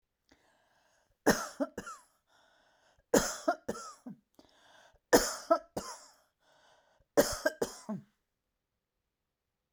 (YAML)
three_cough_length: 9.7 s
three_cough_amplitude: 11040
three_cough_signal_mean_std_ratio: 0.27
survey_phase: beta (2021-08-13 to 2022-03-07)
age: 65+
gender: Female
wearing_mask: 'No'
symptom_none: true
smoker_status: Never smoked
respiratory_condition_asthma: false
respiratory_condition_other: false
recruitment_source: REACT
submission_delay: 1 day
covid_test_result: Negative
covid_test_method: RT-qPCR